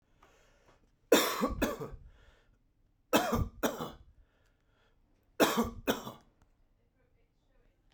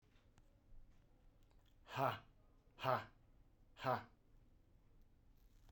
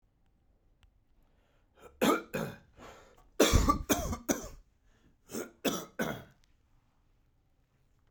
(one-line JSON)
{"three_cough_length": "7.9 s", "three_cough_amplitude": 10079, "three_cough_signal_mean_std_ratio": 0.35, "exhalation_length": "5.7 s", "exhalation_amplitude": 2247, "exhalation_signal_mean_std_ratio": 0.33, "cough_length": "8.1 s", "cough_amplitude": 10690, "cough_signal_mean_std_ratio": 0.34, "survey_phase": "beta (2021-08-13 to 2022-03-07)", "age": "45-64", "gender": "Male", "wearing_mask": "No", "symptom_none": true, "smoker_status": "Never smoked", "respiratory_condition_asthma": false, "respiratory_condition_other": false, "recruitment_source": "REACT", "submission_delay": "6 days", "covid_test_result": "Negative", "covid_test_method": "RT-qPCR"}